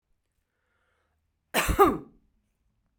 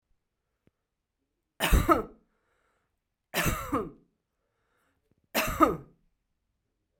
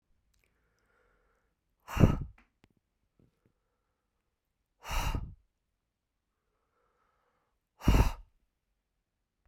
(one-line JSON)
{"cough_length": "3.0 s", "cough_amplitude": 17323, "cough_signal_mean_std_ratio": 0.27, "three_cough_length": "7.0 s", "three_cough_amplitude": 15777, "three_cough_signal_mean_std_ratio": 0.3, "exhalation_length": "9.5 s", "exhalation_amplitude": 11757, "exhalation_signal_mean_std_ratio": 0.22, "survey_phase": "beta (2021-08-13 to 2022-03-07)", "age": "45-64", "gender": "Female", "wearing_mask": "No", "symptom_none": true, "smoker_status": "Ex-smoker", "respiratory_condition_asthma": false, "respiratory_condition_other": false, "recruitment_source": "REACT", "submission_delay": "1 day", "covid_test_result": "Negative", "covid_test_method": "RT-qPCR"}